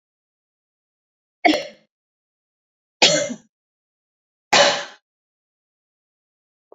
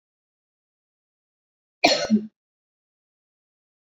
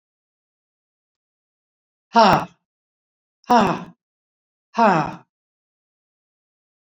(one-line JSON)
{"three_cough_length": "6.7 s", "three_cough_amplitude": 32768, "three_cough_signal_mean_std_ratio": 0.25, "cough_length": "3.9 s", "cough_amplitude": 25789, "cough_signal_mean_std_ratio": 0.22, "exhalation_length": "6.8 s", "exhalation_amplitude": 27877, "exhalation_signal_mean_std_ratio": 0.27, "survey_phase": "beta (2021-08-13 to 2022-03-07)", "age": "65+", "gender": "Female", "wearing_mask": "Yes", "symptom_none": true, "smoker_status": "Never smoked", "respiratory_condition_asthma": false, "respiratory_condition_other": false, "recruitment_source": "REACT", "submission_delay": "5 days", "covid_test_result": "Negative", "covid_test_method": "RT-qPCR", "influenza_a_test_result": "Negative", "influenza_b_test_result": "Negative"}